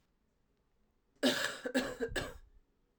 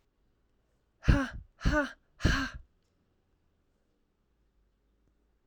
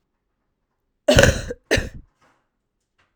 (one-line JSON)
{"three_cough_length": "3.0 s", "three_cough_amplitude": 4677, "three_cough_signal_mean_std_ratio": 0.42, "exhalation_length": "5.5 s", "exhalation_amplitude": 11132, "exhalation_signal_mean_std_ratio": 0.28, "cough_length": "3.2 s", "cough_amplitude": 32768, "cough_signal_mean_std_ratio": 0.29, "survey_phase": "alpha (2021-03-01 to 2021-08-12)", "age": "18-44", "gender": "Female", "wearing_mask": "No", "symptom_cough_any": true, "symptom_fatigue": true, "symptom_fever_high_temperature": true, "symptom_headache": true, "symptom_change_to_sense_of_smell_or_taste": true, "symptom_onset": "2 days", "smoker_status": "Ex-smoker", "respiratory_condition_asthma": false, "respiratory_condition_other": false, "recruitment_source": "Test and Trace", "submission_delay": "2 days", "covid_test_result": "Positive", "covid_test_method": "RT-qPCR", "covid_ct_value": 16.7, "covid_ct_gene": "ORF1ab gene", "covid_ct_mean": 17.7, "covid_viral_load": "1600000 copies/ml", "covid_viral_load_category": "High viral load (>1M copies/ml)"}